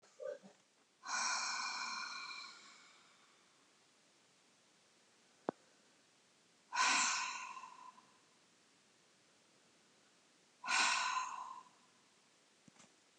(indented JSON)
{
  "exhalation_length": "13.2 s",
  "exhalation_amplitude": 3207,
  "exhalation_signal_mean_std_ratio": 0.41,
  "survey_phase": "beta (2021-08-13 to 2022-03-07)",
  "age": "45-64",
  "gender": "Female",
  "wearing_mask": "No",
  "symptom_cough_any": true,
  "symptom_shortness_of_breath": true,
  "symptom_sore_throat": true,
  "symptom_fever_high_temperature": true,
  "symptom_change_to_sense_of_smell_or_taste": true,
  "symptom_loss_of_taste": true,
  "symptom_onset": "3 days",
  "smoker_status": "Never smoked",
  "respiratory_condition_asthma": true,
  "respiratory_condition_other": false,
  "recruitment_source": "Test and Trace",
  "submission_delay": "1 day",
  "covid_test_result": "Positive",
  "covid_test_method": "LAMP"
}